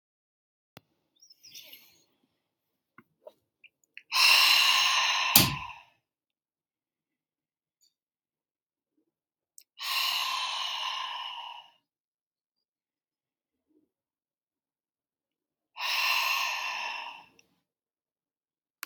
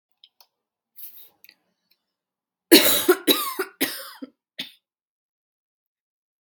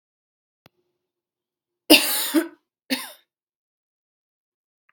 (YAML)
exhalation_length: 18.9 s
exhalation_amplitude: 32632
exhalation_signal_mean_std_ratio: 0.34
three_cough_length: 6.4 s
three_cough_amplitude: 32768
three_cough_signal_mean_std_ratio: 0.26
cough_length: 4.9 s
cough_amplitude: 32768
cough_signal_mean_std_ratio: 0.23
survey_phase: beta (2021-08-13 to 2022-03-07)
age: 18-44
gender: Female
wearing_mask: 'No'
symptom_cough_any: true
symptom_runny_or_blocked_nose: true
symptom_sore_throat: true
symptom_fatigue: true
symptom_headache: true
symptom_other: true
smoker_status: Ex-smoker
respiratory_condition_asthma: true
respiratory_condition_other: false
recruitment_source: Test and Trace
submission_delay: 2 days
covid_test_result: Positive
covid_test_method: ePCR